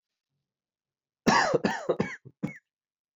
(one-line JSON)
{"cough_length": "3.2 s", "cough_amplitude": 16303, "cough_signal_mean_std_ratio": 0.36, "survey_phase": "beta (2021-08-13 to 2022-03-07)", "age": "18-44", "gender": "Male", "wearing_mask": "Yes", "symptom_cough_any": true, "symptom_new_continuous_cough": true, "symptom_runny_or_blocked_nose": true, "symptom_shortness_of_breath": true, "symptom_sore_throat": true, "symptom_fever_high_temperature": true, "symptom_headache": true, "symptom_change_to_sense_of_smell_or_taste": true, "symptom_onset": "3 days", "smoker_status": "Never smoked", "respiratory_condition_asthma": false, "respiratory_condition_other": false, "recruitment_source": "Test and Trace", "submission_delay": "2 days", "covid_test_result": "Positive", "covid_test_method": "RT-qPCR", "covid_ct_value": 18.8, "covid_ct_gene": "ORF1ab gene", "covid_ct_mean": 19.7, "covid_viral_load": "330000 copies/ml", "covid_viral_load_category": "Low viral load (10K-1M copies/ml)"}